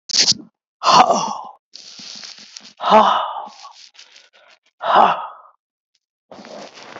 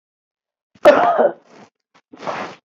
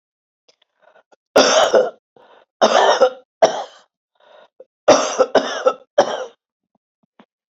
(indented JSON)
{
  "exhalation_length": "7.0 s",
  "exhalation_amplitude": 32660,
  "exhalation_signal_mean_std_ratio": 0.4,
  "cough_length": "2.6 s",
  "cough_amplitude": 27646,
  "cough_signal_mean_std_ratio": 0.37,
  "three_cough_length": "7.5 s",
  "three_cough_amplitude": 30817,
  "three_cough_signal_mean_std_ratio": 0.4,
  "survey_phase": "beta (2021-08-13 to 2022-03-07)",
  "age": "65+",
  "gender": "Female",
  "wearing_mask": "No",
  "symptom_cough_any": true,
  "symptom_runny_or_blocked_nose": true,
  "symptom_shortness_of_breath": true,
  "symptom_sore_throat": true,
  "symptom_abdominal_pain": true,
  "symptom_diarrhoea": true,
  "symptom_fatigue": true,
  "symptom_headache": true,
  "symptom_onset": "1 day",
  "smoker_status": "Never smoked",
  "respiratory_condition_asthma": true,
  "respiratory_condition_other": false,
  "recruitment_source": "Test and Trace",
  "submission_delay": "1 day",
  "covid_test_result": "Positive",
  "covid_test_method": "ePCR"
}